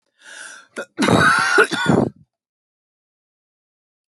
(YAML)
cough_length: 4.1 s
cough_amplitude: 28156
cough_signal_mean_std_ratio: 0.43
survey_phase: alpha (2021-03-01 to 2021-08-12)
age: 45-64
gender: Female
wearing_mask: 'No'
symptom_none: true
smoker_status: Never smoked
respiratory_condition_asthma: false
respiratory_condition_other: false
recruitment_source: REACT
submission_delay: 3 days
covid_test_result: Negative
covid_test_method: RT-qPCR